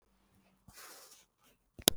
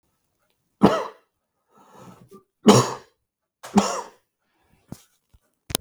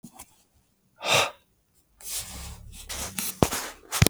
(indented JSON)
{
  "cough_length": "2.0 s",
  "cough_amplitude": 26022,
  "cough_signal_mean_std_ratio": 0.13,
  "three_cough_length": "5.8 s",
  "three_cough_amplitude": 32767,
  "three_cough_signal_mean_std_ratio": 0.25,
  "exhalation_length": "4.1 s",
  "exhalation_amplitude": 32766,
  "exhalation_signal_mean_std_ratio": 0.37,
  "survey_phase": "beta (2021-08-13 to 2022-03-07)",
  "age": "18-44",
  "gender": "Male",
  "wearing_mask": "No",
  "symptom_none": true,
  "smoker_status": "Never smoked",
  "respiratory_condition_asthma": false,
  "respiratory_condition_other": false,
  "recruitment_source": "REACT",
  "submission_delay": "5 days",
  "covid_test_result": "Negative",
  "covid_test_method": "RT-qPCR",
  "influenza_a_test_result": "Negative",
  "influenza_b_test_result": "Negative"
}